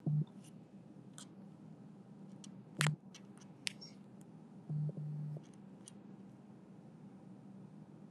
three_cough_length: 8.1 s
three_cough_amplitude: 8146
three_cough_signal_mean_std_ratio: 0.54
survey_phase: alpha (2021-03-01 to 2021-08-12)
age: 45-64
gender: Female
wearing_mask: 'No'
symptom_none: true
smoker_status: Ex-smoker
respiratory_condition_asthma: false
respiratory_condition_other: false
recruitment_source: Test and Trace
submission_delay: 0 days
covid_test_result: Negative
covid_test_method: LFT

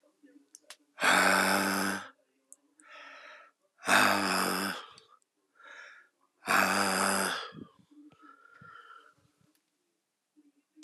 exhalation_length: 10.8 s
exhalation_amplitude: 10508
exhalation_signal_mean_std_ratio: 0.44
survey_phase: beta (2021-08-13 to 2022-03-07)
age: 45-64
gender: Male
wearing_mask: 'No'
symptom_cough_any: true
symptom_new_continuous_cough: true
symptom_shortness_of_breath: true
symptom_abdominal_pain: true
symptom_fatigue: true
symptom_fever_high_temperature: true
symptom_headache: true
symptom_change_to_sense_of_smell_or_taste: true
symptom_loss_of_taste: true
symptom_onset: 5 days
smoker_status: Ex-smoker
respiratory_condition_asthma: false
respiratory_condition_other: false
recruitment_source: Test and Trace
submission_delay: 2 days
covid_test_result: Positive
covid_test_method: RT-qPCR
covid_ct_value: 16.0
covid_ct_gene: ORF1ab gene
covid_ct_mean: 16.4
covid_viral_load: 4200000 copies/ml
covid_viral_load_category: High viral load (>1M copies/ml)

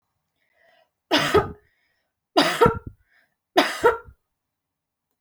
three_cough_length: 5.2 s
three_cough_amplitude: 25359
three_cough_signal_mean_std_ratio: 0.33
survey_phase: alpha (2021-03-01 to 2021-08-12)
age: 45-64
gender: Female
wearing_mask: 'No'
symptom_none: true
smoker_status: Never smoked
respiratory_condition_asthma: false
respiratory_condition_other: false
recruitment_source: REACT
submission_delay: 4 days
covid_test_result: Negative
covid_test_method: RT-qPCR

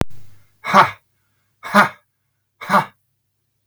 exhalation_length: 3.7 s
exhalation_amplitude: 32768
exhalation_signal_mean_std_ratio: 0.34
survey_phase: beta (2021-08-13 to 2022-03-07)
age: 45-64
gender: Male
wearing_mask: 'No'
symptom_none: true
smoker_status: Ex-smoker
respiratory_condition_asthma: false
respiratory_condition_other: false
recruitment_source: Test and Trace
submission_delay: 2 days
covid_test_result: Negative
covid_test_method: RT-qPCR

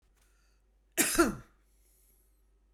cough_length: 2.7 s
cough_amplitude: 9091
cough_signal_mean_std_ratio: 0.28
survey_phase: beta (2021-08-13 to 2022-03-07)
age: 45-64
gender: Female
wearing_mask: 'No'
symptom_none: true
smoker_status: Current smoker (1 to 10 cigarettes per day)
respiratory_condition_asthma: false
respiratory_condition_other: false
recruitment_source: REACT
submission_delay: 3 days
covid_test_result: Negative
covid_test_method: RT-qPCR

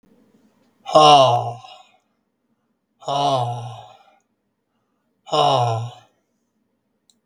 exhalation_length: 7.3 s
exhalation_amplitude: 32768
exhalation_signal_mean_std_ratio: 0.37
survey_phase: beta (2021-08-13 to 2022-03-07)
age: 65+
gender: Male
wearing_mask: 'No'
symptom_none: true
smoker_status: Never smoked
respiratory_condition_asthma: false
respiratory_condition_other: false
recruitment_source: REACT
submission_delay: 3 days
covid_test_result: Negative
covid_test_method: RT-qPCR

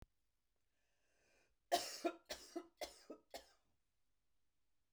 cough_length: 4.9 s
cough_amplitude: 2091
cough_signal_mean_std_ratio: 0.27
survey_phase: beta (2021-08-13 to 2022-03-07)
age: 45-64
gender: Female
wearing_mask: 'No'
symptom_none: true
smoker_status: Current smoker (1 to 10 cigarettes per day)
respiratory_condition_asthma: false
respiratory_condition_other: false
recruitment_source: REACT
submission_delay: 2 days
covid_test_result: Negative
covid_test_method: RT-qPCR
influenza_a_test_result: Negative
influenza_b_test_result: Negative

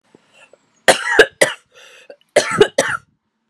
cough_length: 3.5 s
cough_amplitude: 32768
cough_signal_mean_std_ratio: 0.35
survey_phase: beta (2021-08-13 to 2022-03-07)
age: 45-64
gender: Female
wearing_mask: 'No'
symptom_cough_any: true
symptom_runny_or_blocked_nose: true
symptom_shortness_of_breath: true
symptom_fatigue: true
symptom_fever_high_temperature: true
symptom_headache: true
symptom_other: true
symptom_onset: 3 days
smoker_status: Ex-smoker
respiratory_condition_asthma: false
respiratory_condition_other: false
recruitment_source: Test and Trace
submission_delay: 1 day
covid_test_result: Positive
covid_test_method: RT-qPCR
covid_ct_value: 24.4
covid_ct_gene: ORF1ab gene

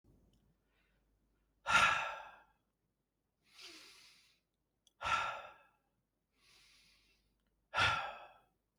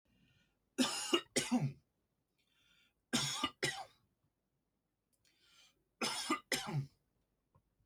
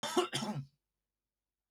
exhalation_length: 8.8 s
exhalation_amplitude: 5132
exhalation_signal_mean_std_ratio: 0.3
three_cough_length: 7.9 s
three_cough_amplitude: 4308
three_cough_signal_mean_std_ratio: 0.39
cough_length: 1.7 s
cough_amplitude: 4630
cough_signal_mean_std_ratio: 0.42
survey_phase: alpha (2021-03-01 to 2021-08-12)
age: 18-44
gender: Male
wearing_mask: 'No'
symptom_none: true
smoker_status: Never smoked
respiratory_condition_asthma: false
respiratory_condition_other: false
recruitment_source: REACT
submission_delay: 1 day
covid_test_result: Negative
covid_test_method: RT-qPCR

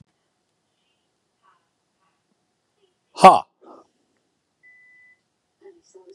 exhalation_length: 6.1 s
exhalation_amplitude: 32768
exhalation_signal_mean_std_ratio: 0.13
survey_phase: beta (2021-08-13 to 2022-03-07)
age: 45-64
gender: Male
wearing_mask: 'No'
symptom_none: true
smoker_status: Ex-smoker
respiratory_condition_asthma: false
respiratory_condition_other: false
recruitment_source: REACT
submission_delay: 2 days
covid_test_result: Negative
covid_test_method: RT-qPCR
influenza_a_test_result: Negative
influenza_b_test_result: Negative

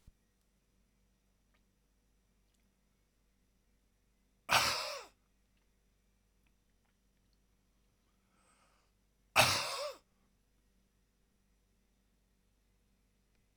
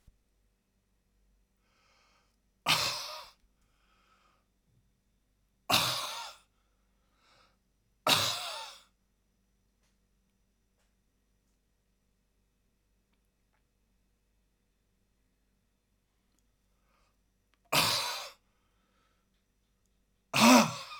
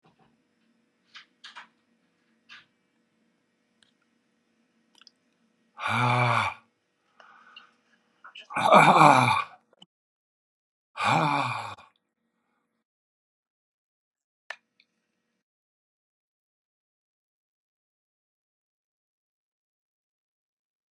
cough_length: 13.6 s
cough_amplitude: 9870
cough_signal_mean_std_ratio: 0.2
three_cough_length: 21.0 s
three_cough_amplitude: 12019
three_cough_signal_mean_std_ratio: 0.23
exhalation_length: 20.9 s
exhalation_amplitude: 25902
exhalation_signal_mean_std_ratio: 0.23
survey_phase: alpha (2021-03-01 to 2021-08-12)
age: 65+
gender: Male
wearing_mask: 'No'
symptom_none: true
smoker_status: Never smoked
respiratory_condition_asthma: false
respiratory_condition_other: false
recruitment_source: REACT
submission_delay: 1 day
covid_test_result: Negative
covid_test_method: RT-qPCR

